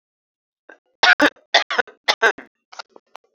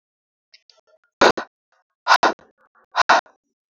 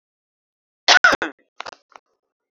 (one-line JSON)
{"three_cough_length": "3.3 s", "three_cough_amplitude": 30991, "three_cough_signal_mean_std_ratio": 0.3, "exhalation_length": "3.7 s", "exhalation_amplitude": 31641, "exhalation_signal_mean_std_ratio": 0.28, "cough_length": "2.5 s", "cough_amplitude": 30984, "cough_signal_mean_std_ratio": 0.25, "survey_phase": "beta (2021-08-13 to 2022-03-07)", "age": "18-44", "gender": "Female", "wearing_mask": "No", "symptom_none": true, "smoker_status": "Never smoked", "respiratory_condition_asthma": false, "respiratory_condition_other": false, "recruitment_source": "REACT", "submission_delay": "4 days", "covid_test_result": "Negative", "covid_test_method": "RT-qPCR", "covid_ct_value": 39.0, "covid_ct_gene": "N gene", "influenza_a_test_result": "Negative", "influenza_b_test_result": "Negative"}